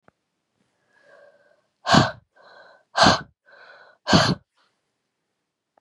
exhalation_length: 5.8 s
exhalation_amplitude: 28405
exhalation_signal_mean_std_ratio: 0.28
survey_phase: beta (2021-08-13 to 2022-03-07)
age: 18-44
gender: Female
wearing_mask: 'No'
symptom_cough_any: true
symptom_new_continuous_cough: true
symptom_sore_throat: true
symptom_fatigue: true
symptom_onset: 3 days
smoker_status: Never smoked
respiratory_condition_asthma: false
respiratory_condition_other: false
recruitment_source: Test and Trace
submission_delay: 2 days
covid_test_result: Positive
covid_test_method: RT-qPCR
covid_ct_value: 19.8
covid_ct_gene: ORF1ab gene
covid_ct_mean: 20.9
covid_viral_load: 140000 copies/ml
covid_viral_load_category: Low viral load (10K-1M copies/ml)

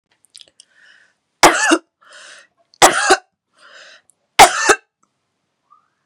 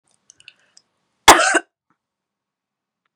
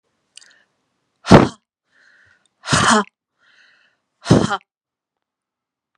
three_cough_length: 6.1 s
three_cough_amplitude: 32768
three_cough_signal_mean_std_ratio: 0.29
cough_length: 3.2 s
cough_amplitude: 32768
cough_signal_mean_std_ratio: 0.22
exhalation_length: 6.0 s
exhalation_amplitude: 32768
exhalation_signal_mean_std_ratio: 0.26
survey_phase: beta (2021-08-13 to 2022-03-07)
age: 45-64
gender: Female
wearing_mask: 'No'
symptom_none: true
smoker_status: Never smoked
respiratory_condition_asthma: false
respiratory_condition_other: false
recruitment_source: REACT
submission_delay: 3 days
covid_test_result: Negative
covid_test_method: RT-qPCR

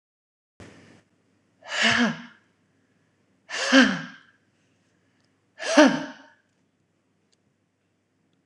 exhalation_length: 8.5 s
exhalation_amplitude: 26027
exhalation_signal_mean_std_ratio: 0.28
survey_phase: alpha (2021-03-01 to 2021-08-12)
age: 45-64
gender: Female
wearing_mask: 'Yes'
symptom_none: true
smoker_status: Current smoker (1 to 10 cigarettes per day)
respiratory_condition_asthma: false
respiratory_condition_other: false
recruitment_source: REACT
submission_delay: 3 days
covid_test_result: Negative
covid_test_method: RT-qPCR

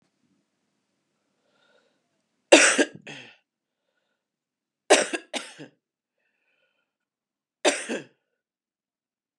three_cough_length: 9.4 s
three_cough_amplitude: 32767
three_cough_signal_mean_std_ratio: 0.21
survey_phase: beta (2021-08-13 to 2022-03-07)
age: 45-64
gender: Female
wearing_mask: 'No'
symptom_cough_any: true
symptom_new_continuous_cough: true
symptom_runny_or_blocked_nose: true
symptom_shortness_of_breath: true
symptom_sore_throat: true
symptom_fatigue: true
symptom_onset: 3 days
smoker_status: Ex-smoker
respiratory_condition_asthma: false
respiratory_condition_other: false
recruitment_source: Test and Trace
submission_delay: 1 day
covid_test_result: Positive
covid_test_method: RT-qPCR
covid_ct_value: 12.6
covid_ct_gene: N gene
covid_ct_mean: 12.7
covid_viral_load: 68000000 copies/ml
covid_viral_load_category: High viral load (>1M copies/ml)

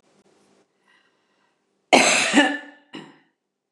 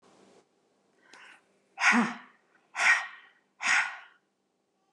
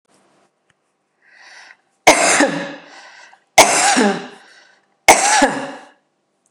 cough_length: 3.7 s
cough_amplitude: 29204
cough_signal_mean_std_ratio: 0.32
exhalation_length: 4.9 s
exhalation_amplitude: 10570
exhalation_signal_mean_std_ratio: 0.35
three_cough_length: 6.5 s
three_cough_amplitude: 29204
three_cough_signal_mean_std_ratio: 0.4
survey_phase: beta (2021-08-13 to 2022-03-07)
age: 45-64
gender: Female
wearing_mask: 'No'
symptom_none: true
smoker_status: Never smoked
respiratory_condition_asthma: false
respiratory_condition_other: false
recruitment_source: REACT
submission_delay: 0 days
covid_test_result: Negative
covid_test_method: RT-qPCR
influenza_a_test_result: Negative
influenza_b_test_result: Negative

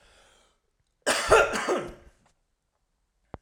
cough_length: 3.4 s
cough_amplitude: 22031
cough_signal_mean_std_ratio: 0.34
survey_phase: alpha (2021-03-01 to 2021-08-12)
age: 18-44
gender: Male
wearing_mask: 'No'
symptom_none: true
smoker_status: Ex-smoker
respiratory_condition_asthma: false
respiratory_condition_other: false
recruitment_source: REACT
submission_delay: 1 day
covid_test_result: Negative
covid_test_method: RT-qPCR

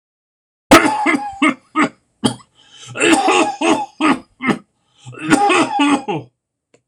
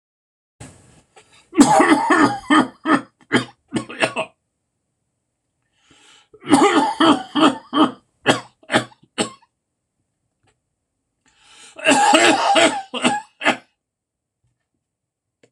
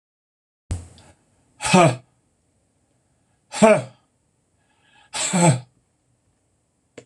cough_length: 6.9 s
cough_amplitude: 26028
cough_signal_mean_std_ratio: 0.55
three_cough_length: 15.5 s
three_cough_amplitude: 26028
three_cough_signal_mean_std_ratio: 0.42
exhalation_length: 7.1 s
exhalation_amplitude: 26027
exhalation_signal_mean_std_ratio: 0.29
survey_phase: beta (2021-08-13 to 2022-03-07)
age: 65+
gender: Male
wearing_mask: 'No'
symptom_fatigue: true
smoker_status: Never smoked
respiratory_condition_asthma: false
respiratory_condition_other: false
recruitment_source: REACT
submission_delay: 1 day
covid_test_result: Negative
covid_test_method: RT-qPCR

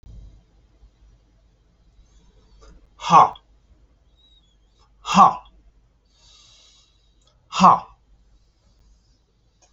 exhalation_length: 9.7 s
exhalation_amplitude: 30624
exhalation_signal_mean_std_ratio: 0.22
survey_phase: alpha (2021-03-01 to 2021-08-12)
age: 45-64
gender: Male
wearing_mask: 'No'
symptom_none: true
smoker_status: Never smoked
respiratory_condition_asthma: false
respiratory_condition_other: false
recruitment_source: REACT
submission_delay: 2 days
covid_test_result: Negative
covid_test_method: RT-qPCR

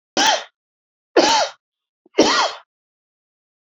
three_cough_length: 3.8 s
three_cough_amplitude: 29084
three_cough_signal_mean_std_ratio: 0.39
survey_phase: beta (2021-08-13 to 2022-03-07)
age: 65+
gender: Male
wearing_mask: 'No'
symptom_none: true
smoker_status: Never smoked
respiratory_condition_asthma: false
respiratory_condition_other: false
recruitment_source: REACT
submission_delay: 3 days
covid_test_result: Negative
covid_test_method: RT-qPCR
influenza_a_test_result: Negative
influenza_b_test_result: Negative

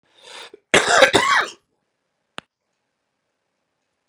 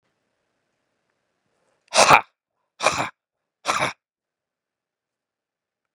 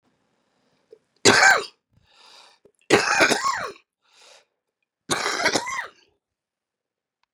cough_length: 4.1 s
cough_amplitude: 32768
cough_signal_mean_std_ratio: 0.31
exhalation_length: 5.9 s
exhalation_amplitude: 32768
exhalation_signal_mean_std_ratio: 0.22
three_cough_length: 7.3 s
three_cough_amplitude: 29768
three_cough_signal_mean_std_ratio: 0.34
survey_phase: beta (2021-08-13 to 2022-03-07)
age: 45-64
gender: Male
wearing_mask: 'No'
symptom_runny_or_blocked_nose: true
symptom_onset: 5 days
smoker_status: Ex-smoker
respiratory_condition_asthma: true
respiratory_condition_other: false
recruitment_source: REACT
submission_delay: 1 day
covid_test_result: Negative
covid_test_method: RT-qPCR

